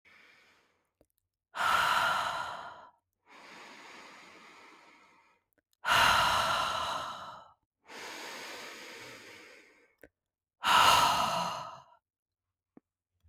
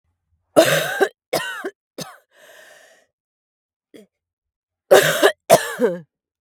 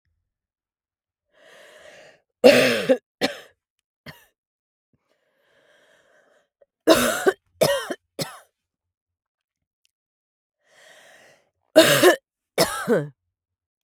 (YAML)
exhalation_length: 13.3 s
exhalation_amplitude: 10991
exhalation_signal_mean_std_ratio: 0.43
cough_length: 6.4 s
cough_amplitude: 32768
cough_signal_mean_std_ratio: 0.34
three_cough_length: 13.8 s
three_cough_amplitude: 32767
three_cough_signal_mean_std_ratio: 0.28
survey_phase: beta (2021-08-13 to 2022-03-07)
age: 18-44
gender: Female
wearing_mask: 'No'
symptom_new_continuous_cough: true
symptom_runny_or_blocked_nose: true
symptom_shortness_of_breath: true
symptom_fatigue: true
symptom_headache: true
symptom_onset: 3 days
smoker_status: Ex-smoker
respiratory_condition_asthma: false
respiratory_condition_other: false
recruitment_source: Test and Trace
submission_delay: 1 day
covid_test_result: Positive
covid_test_method: RT-qPCR
covid_ct_value: 27.4
covid_ct_gene: N gene